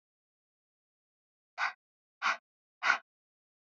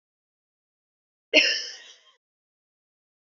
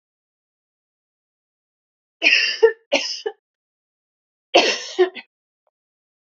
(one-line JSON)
{"exhalation_length": "3.8 s", "exhalation_amplitude": 8680, "exhalation_signal_mean_std_ratio": 0.24, "cough_length": "3.2 s", "cough_amplitude": 22156, "cough_signal_mean_std_ratio": 0.23, "three_cough_length": "6.2 s", "three_cough_amplitude": 29853, "three_cough_signal_mean_std_ratio": 0.3, "survey_phase": "beta (2021-08-13 to 2022-03-07)", "age": "18-44", "gender": "Female", "wearing_mask": "No", "symptom_cough_any": true, "symptom_sore_throat": true, "symptom_abdominal_pain": true, "symptom_fatigue": true, "symptom_fever_high_temperature": true, "symptom_headache": true, "symptom_onset": "3 days", "smoker_status": "Never smoked", "respiratory_condition_asthma": false, "respiratory_condition_other": false, "recruitment_source": "Test and Trace", "submission_delay": "1 day", "covid_test_result": "Positive", "covid_test_method": "RT-qPCR", "covid_ct_value": 27.9, "covid_ct_gene": "N gene"}